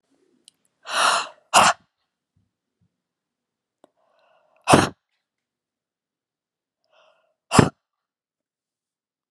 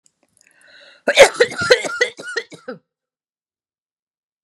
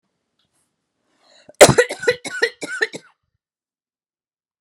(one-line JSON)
{"exhalation_length": "9.3 s", "exhalation_amplitude": 32768, "exhalation_signal_mean_std_ratio": 0.22, "three_cough_length": "4.4 s", "three_cough_amplitude": 32768, "three_cough_signal_mean_std_ratio": 0.29, "cough_length": "4.6 s", "cough_amplitude": 32768, "cough_signal_mean_std_ratio": 0.24, "survey_phase": "beta (2021-08-13 to 2022-03-07)", "age": "45-64", "gender": "Female", "wearing_mask": "No", "symptom_runny_or_blocked_nose": true, "smoker_status": "Never smoked", "respiratory_condition_asthma": false, "respiratory_condition_other": false, "recruitment_source": "REACT", "submission_delay": "4 days", "covid_test_result": "Negative", "covid_test_method": "RT-qPCR"}